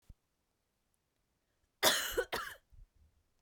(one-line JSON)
{"cough_length": "3.4 s", "cough_amplitude": 8807, "cough_signal_mean_std_ratio": 0.3, "survey_phase": "beta (2021-08-13 to 2022-03-07)", "age": "18-44", "gender": "Female", "wearing_mask": "No", "symptom_cough_any": true, "symptom_new_continuous_cough": true, "symptom_runny_or_blocked_nose": true, "symptom_sore_throat": true, "symptom_fatigue": true, "symptom_headache": true, "smoker_status": "Never smoked", "respiratory_condition_asthma": false, "respiratory_condition_other": false, "recruitment_source": "Test and Trace", "submission_delay": "1 day", "covid_test_result": "Negative", "covid_test_method": "RT-qPCR"}